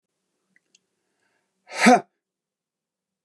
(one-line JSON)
{"exhalation_length": "3.2 s", "exhalation_amplitude": 25800, "exhalation_signal_mean_std_ratio": 0.2, "survey_phase": "beta (2021-08-13 to 2022-03-07)", "age": "45-64", "gender": "Male", "wearing_mask": "No", "symptom_sore_throat": true, "symptom_onset": "8 days", "smoker_status": "Never smoked", "respiratory_condition_asthma": true, "respiratory_condition_other": false, "recruitment_source": "REACT", "submission_delay": "1 day", "covid_test_result": "Negative", "covid_test_method": "RT-qPCR"}